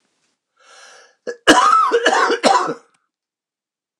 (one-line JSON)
{"cough_length": "4.0 s", "cough_amplitude": 29204, "cough_signal_mean_std_ratio": 0.46, "survey_phase": "beta (2021-08-13 to 2022-03-07)", "age": "65+", "gender": "Male", "wearing_mask": "No", "symptom_cough_any": true, "symptom_runny_or_blocked_nose": true, "symptom_shortness_of_breath": true, "symptom_fatigue": true, "symptom_headache": true, "symptom_change_to_sense_of_smell_or_taste": true, "symptom_loss_of_taste": true, "smoker_status": "Ex-smoker", "respiratory_condition_asthma": false, "respiratory_condition_other": false, "recruitment_source": "Test and Trace", "submission_delay": "1 day", "covid_test_result": "Positive", "covid_test_method": "LFT"}